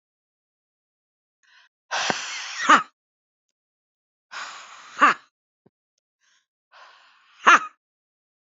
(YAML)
exhalation_length: 8.5 s
exhalation_amplitude: 27654
exhalation_signal_mean_std_ratio: 0.23
survey_phase: beta (2021-08-13 to 2022-03-07)
age: 45-64
gender: Female
wearing_mask: 'No'
symptom_cough_any: true
symptom_runny_or_blocked_nose: true
symptom_headache: true
symptom_other: true
symptom_onset: 2 days
smoker_status: Ex-smoker
respiratory_condition_asthma: false
respiratory_condition_other: false
recruitment_source: Test and Trace
submission_delay: 2 days
covid_test_result: Positive
covid_test_method: RT-qPCR
covid_ct_value: 24.1
covid_ct_gene: ORF1ab gene
covid_ct_mean: 24.5
covid_viral_load: 9500 copies/ml
covid_viral_load_category: Minimal viral load (< 10K copies/ml)